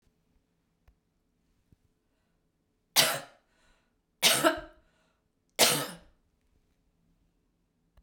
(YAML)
three_cough_length: 8.0 s
three_cough_amplitude: 17188
three_cough_signal_mean_std_ratio: 0.25
survey_phase: beta (2021-08-13 to 2022-03-07)
age: 65+
gender: Female
wearing_mask: 'No'
symptom_none: true
smoker_status: Never smoked
respiratory_condition_asthma: false
respiratory_condition_other: false
recruitment_source: REACT
submission_delay: 2 days
covid_test_result: Negative
covid_test_method: RT-qPCR